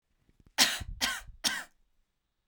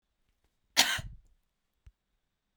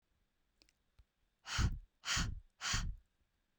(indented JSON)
{
  "three_cough_length": "2.5 s",
  "three_cough_amplitude": 12366,
  "three_cough_signal_mean_std_ratio": 0.37,
  "cough_length": "2.6 s",
  "cough_amplitude": 14774,
  "cough_signal_mean_std_ratio": 0.22,
  "exhalation_length": "3.6 s",
  "exhalation_amplitude": 2295,
  "exhalation_signal_mean_std_ratio": 0.43,
  "survey_phase": "beta (2021-08-13 to 2022-03-07)",
  "age": "18-44",
  "gender": "Female",
  "wearing_mask": "No",
  "symptom_none": true,
  "smoker_status": "Never smoked",
  "respiratory_condition_asthma": false,
  "respiratory_condition_other": false,
  "recruitment_source": "REACT",
  "submission_delay": "0 days",
  "covid_test_result": "Negative",
  "covid_test_method": "RT-qPCR"
}